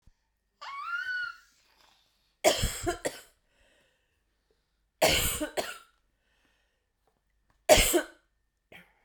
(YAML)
three_cough_length: 9.0 s
three_cough_amplitude: 17435
three_cough_signal_mean_std_ratio: 0.33
survey_phase: beta (2021-08-13 to 2022-03-07)
age: 18-44
gender: Female
wearing_mask: 'No'
symptom_cough_any: true
symptom_new_continuous_cough: true
symptom_runny_or_blocked_nose: true
symptom_fatigue: true
symptom_fever_high_temperature: true
symptom_headache: true
symptom_change_to_sense_of_smell_or_taste: true
symptom_loss_of_taste: true
symptom_onset: 2 days
smoker_status: Never smoked
respiratory_condition_asthma: false
respiratory_condition_other: false
recruitment_source: Test and Trace
submission_delay: 2 days
covid_test_result: Positive
covid_test_method: RT-qPCR
covid_ct_value: 16.6
covid_ct_gene: ORF1ab gene
covid_ct_mean: 17.2
covid_viral_load: 2400000 copies/ml
covid_viral_load_category: High viral load (>1M copies/ml)